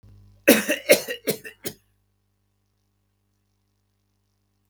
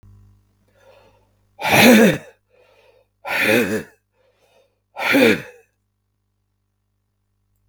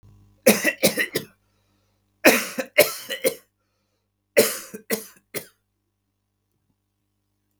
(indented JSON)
{
  "cough_length": "4.7 s",
  "cough_amplitude": 32768,
  "cough_signal_mean_std_ratio": 0.24,
  "exhalation_length": "7.7 s",
  "exhalation_amplitude": 32768,
  "exhalation_signal_mean_std_ratio": 0.34,
  "three_cough_length": "7.6 s",
  "three_cough_amplitude": 32768,
  "three_cough_signal_mean_std_ratio": 0.3,
  "survey_phase": "beta (2021-08-13 to 2022-03-07)",
  "age": "65+",
  "gender": "Male",
  "wearing_mask": "No",
  "symptom_none": true,
  "symptom_onset": "12 days",
  "smoker_status": "Never smoked",
  "respiratory_condition_asthma": false,
  "respiratory_condition_other": false,
  "recruitment_source": "REACT",
  "submission_delay": "1 day",
  "covid_test_result": "Negative",
  "covid_test_method": "RT-qPCR"
}